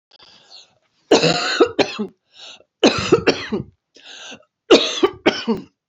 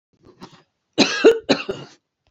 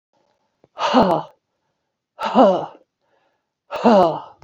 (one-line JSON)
{"three_cough_length": "5.9 s", "three_cough_amplitude": 30184, "three_cough_signal_mean_std_ratio": 0.43, "cough_length": "2.3 s", "cough_amplitude": 29437, "cough_signal_mean_std_ratio": 0.34, "exhalation_length": "4.4 s", "exhalation_amplitude": 28494, "exhalation_signal_mean_std_ratio": 0.4, "survey_phase": "beta (2021-08-13 to 2022-03-07)", "age": "45-64", "gender": "Female", "wearing_mask": "No", "symptom_runny_or_blocked_nose": true, "symptom_fatigue": true, "symptom_onset": "12 days", "smoker_status": "Never smoked", "respiratory_condition_asthma": true, "respiratory_condition_other": false, "recruitment_source": "REACT", "submission_delay": "1 day", "covid_test_result": "Negative", "covid_test_method": "RT-qPCR"}